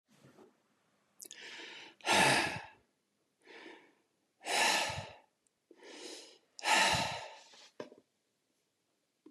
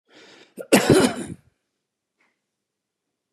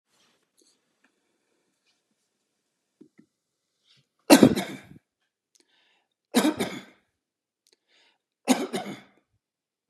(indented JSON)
{
  "exhalation_length": "9.3 s",
  "exhalation_amplitude": 5981,
  "exhalation_signal_mean_std_ratio": 0.37,
  "cough_length": "3.3 s",
  "cough_amplitude": 28234,
  "cough_signal_mean_std_ratio": 0.29,
  "three_cough_length": "9.9 s",
  "three_cough_amplitude": 32474,
  "three_cough_signal_mean_std_ratio": 0.2,
  "survey_phase": "beta (2021-08-13 to 2022-03-07)",
  "age": "65+",
  "gender": "Male",
  "wearing_mask": "No",
  "symptom_none": true,
  "smoker_status": "Never smoked",
  "respiratory_condition_asthma": false,
  "respiratory_condition_other": false,
  "recruitment_source": "REACT",
  "submission_delay": "3 days",
  "covid_test_result": "Negative",
  "covid_test_method": "RT-qPCR",
  "influenza_a_test_result": "Negative",
  "influenza_b_test_result": "Negative"
}